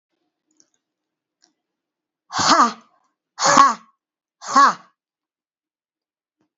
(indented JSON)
{
  "exhalation_length": "6.6 s",
  "exhalation_amplitude": 32768,
  "exhalation_signal_mean_std_ratio": 0.29,
  "survey_phase": "beta (2021-08-13 to 2022-03-07)",
  "age": "65+",
  "gender": "Female",
  "wearing_mask": "No",
  "symptom_cough_any": true,
  "smoker_status": "Never smoked",
  "respiratory_condition_asthma": true,
  "respiratory_condition_other": false,
  "recruitment_source": "Test and Trace",
  "submission_delay": "0 days",
  "covid_test_result": "Negative",
  "covid_test_method": "LFT"
}